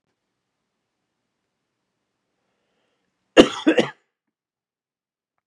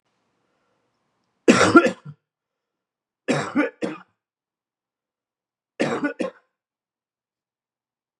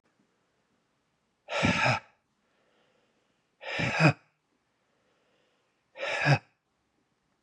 {
  "cough_length": "5.5 s",
  "cough_amplitude": 32768,
  "cough_signal_mean_std_ratio": 0.16,
  "three_cough_length": "8.2 s",
  "three_cough_amplitude": 32068,
  "three_cough_signal_mean_std_ratio": 0.26,
  "exhalation_length": "7.4 s",
  "exhalation_amplitude": 13145,
  "exhalation_signal_mean_std_ratio": 0.31,
  "survey_phase": "beta (2021-08-13 to 2022-03-07)",
  "age": "45-64",
  "gender": "Male",
  "wearing_mask": "No",
  "symptom_cough_any": true,
  "symptom_headache": true,
  "symptom_onset": "6 days",
  "smoker_status": "Never smoked",
  "respiratory_condition_asthma": false,
  "respiratory_condition_other": false,
  "recruitment_source": "Test and Trace",
  "submission_delay": "2 days",
  "covid_test_result": "Positive",
  "covid_test_method": "RT-qPCR",
  "covid_ct_value": 23.8,
  "covid_ct_gene": "ORF1ab gene",
  "covid_ct_mean": 24.6,
  "covid_viral_load": "8700 copies/ml",
  "covid_viral_load_category": "Minimal viral load (< 10K copies/ml)"
}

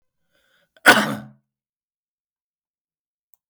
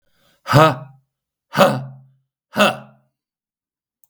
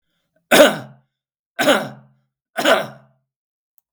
{
  "cough_length": "3.5 s",
  "cough_amplitude": 32768,
  "cough_signal_mean_std_ratio": 0.19,
  "exhalation_length": "4.1 s",
  "exhalation_amplitude": 32768,
  "exhalation_signal_mean_std_ratio": 0.32,
  "three_cough_length": "3.9 s",
  "three_cough_amplitude": 32768,
  "three_cough_signal_mean_std_ratio": 0.33,
  "survey_phase": "beta (2021-08-13 to 2022-03-07)",
  "age": "65+",
  "gender": "Male",
  "wearing_mask": "No",
  "symptom_none": true,
  "smoker_status": "Ex-smoker",
  "respiratory_condition_asthma": false,
  "respiratory_condition_other": false,
  "recruitment_source": "REACT",
  "submission_delay": "4 days",
  "covid_test_result": "Negative",
  "covid_test_method": "RT-qPCR",
  "influenza_a_test_result": "Negative",
  "influenza_b_test_result": "Negative"
}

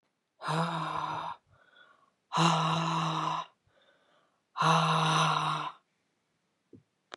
{
  "exhalation_length": "7.2 s",
  "exhalation_amplitude": 8557,
  "exhalation_signal_mean_std_ratio": 0.56,
  "survey_phase": "beta (2021-08-13 to 2022-03-07)",
  "age": "45-64",
  "gender": "Female",
  "wearing_mask": "No",
  "symptom_cough_any": true,
  "symptom_runny_or_blocked_nose": true,
  "symptom_sore_throat": true,
  "symptom_abdominal_pain": true,
  "symptom_fatigue": true,
  "symptom_headache": true,
  "symptom_change_to_sense_of_smell_or_taste": true,
  "symptom_loss_of_taste": true,
  "smoker_status": "Never smoked",
  "respiratory_condition_asthma": true,
  "respiratory_condition_other": false,
  "recruitment_source": "Test and Trace",
  "submission_delay": "6 days",
  "covid_test_result": "Positive",
  "covid_test_method": "LFT"
}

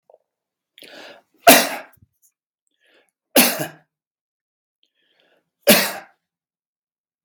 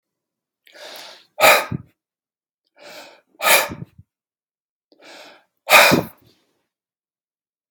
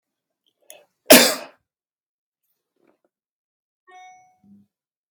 {
  "three_cough_length": "7.2 s",
  "three_cough_amplitude": 32768,
  "three_cough_signal_mean_std_ratio": 0.24,
  "exhalation_length": "7.7 s",
  "exhalation_amplitude": 32768,
  "exhalation_signal_mean_std_ratio": 0.27,
  "cough_length": "5.1 s",
  "cough_amplitude": 32768,
  "cough_signal_mean_std_ratio": 0.17,
  "survey_phase": "beta (2021-08-13 to 2022-03-07)",
  "age": "65+",
  "gender": "Male",
  "wearing_mask": "No",
  "symptom_none": true,
  "smoker_status": "Ex-smoker",
  "respiratory_condition_asthma": true,
  "respiratory_condition_other": false,
  "recruitment_source": "Test and Trace",
  "submission_delay": "0 days",
  "covid_test_result": "Negative",
  "covid_test_method": "LFT"
}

